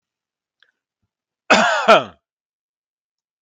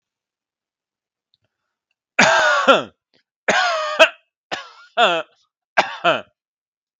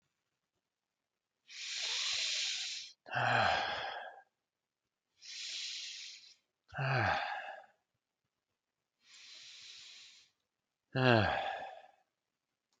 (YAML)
cough_length: 3.4 s
cough_amplitude: 32768
cough_signal_mean_std_ratio: 0.28
three_cough_length: 7.0 s
three_cough_amplitude: 32768
three_cough_signal_mean_std_ratio: 0.38
exhalation_length: 12.8 s
exhalation_amplitude: 6443
exhalation_signal_mean_std_ratio: 0.45
survey_phase: beta (2021-08-13 to 2022-03-07)
age: 45-64
gender: Male
wearing_mask: 'No'
symptom_none: true
smoker_status: Never smoked
respiratory_condition_asthma: false
respiratory_condition_other: false
recruitment_source: REACT
submission_delay: 1 day
covid_test_result: Negative
covid_test_method: RT-qPCR
influenza_a_test_result: Negative
influenza_b_test_result: Negative